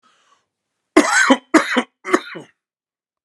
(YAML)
three_cough_length: 3.2 s
three_cough_amplitude: 32768
three_cough_signal_mean_std_ratio: 0.36
survey_phase: beta (2021-08-13 to 2022-03-07)
age: 45-64
gender: Male
wearing_mask: 'No'
symptom_cough_any: true
symptom_sore_throat: true
symptom_diarrhoea: true
symptom_fatigue: true
symptom_headache: true
symptom_change_to_sense_of_smell_or_taste: true
symptom_onset: 2 days
smoker_status: Current smoker (e-cigarettes or vapes only)
respiratory_condition_asthma: false
respiratory_condition_other: false
recruitment_source: Test and Trace
submission_delay: 1 day
covid_test_result: Positive
covid_test_method: ePCR